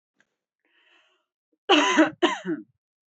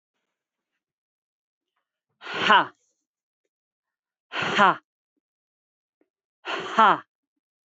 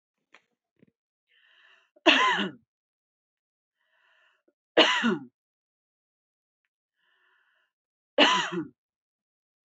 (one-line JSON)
{"cough_length": "3.2 s", "cough_amplitude": 18562, "cough_signal_mean_std_ratio": 0.35, "exhalation_length": "7.8 s", "exhalation_amplitude": 21137, "exhalation_signal_mean_std_ratio": 0.25, "three_cough_length": "9.6 s", "three_cough_amplitude": 19213, "three_cough_signal_mean_std_ratio": 0.27, "survey_phase": "beta (2021-08-13 to 2022-03-07)", "age": "18-44", "gender": "Female", "wearing_mask": "No", "symptom_none": true, "smoker_status": "Ex-smoker", "respiratory_condition_asthma": true, "respiratory_condition_other": false, "recruitment_source": "REACT", "submission_delay": "2 days", "covid_test_result": "Negative", "covid_test_method": "RT-qPCR", "influenza_a_test_result": "Negative", "influenza_b_test_result": "Negative"}